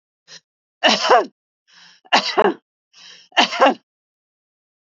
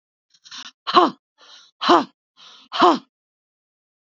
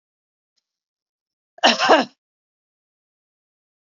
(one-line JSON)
{"three_cough_length": "4.9 s", "three_cough_amplitude": 32767, "three_cough_signal_mean_std_ratio": 0.35, "exhalation_length": "4.1 s", "exhalation_amplitude": 27567, "exhalation_signal_mean_std_ratio": 0.3, "cough_length": "3.8 s", "cough_amplitude": 29317, "cough_signal_mean_std_ratio": 0.23, "survey_phase": "beta (2021-08-13 to 2022-03-07)", "age": "65+", "gender": "Female", "wearing_mask": "No", "symptom_none": true, "smoker_status": "Never smoked", "respiratory_condition_asthma": true, "respiratory_condition_other": false, "recruitment_source": "REACT", "submission_delay": "2 days", "covid_test_result": "Negative", "covid_test_method": "RT-qPCR", "influenza_a_test_result": "Negative", "influenza_b_test_result": "Negative"}